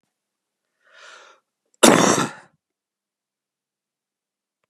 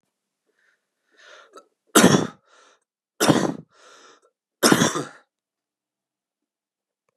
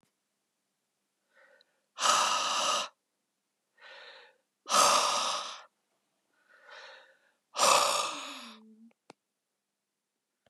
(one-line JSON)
{"cough_length": "4.7 s", "cough_amplitude": 32768, "cough_signal_mean_std_ratio": 0.23, "three_cough_length": "7.2 s", "three_cough_amplitude": 32733, "three_cough_signal_mean_std_ratio": 0.27, "exhalation_length": "10.5 s", "exhalation_amplitude": 11539, "exhalation_signal_mean_std_ratio": 0.38, "survey_phase": "beta (2021-08-13 to 2022-03-07)", "age": "18-44", "gender": "Male", "wearing_mask": "No", "symptom_cough_any": true, "symptom_new_continuous_cough": true, "symptom_fatigue": true, "symptom_change_to_sense_of_smell_or_taste": true, "symptom_onset": "2 days", "smoker_status": "Never smoked", "respiratory_condition_asthma": false, "respiratory_condition_other": false, "recruitment_source": "Test and Trace", "submission_delay": "2 days", "covid_test_result": "Positive", "covid_test_method": "RT-qPCR", "covid_ct_value": 17.1, "covid_ct_gene": "ORF1ab gene", "covid_ct_mean": 17.3, "covid_viral_load": "2100000 copies/ml", "covid_viral_load_category": "High viral load (>1M copies/ml)"}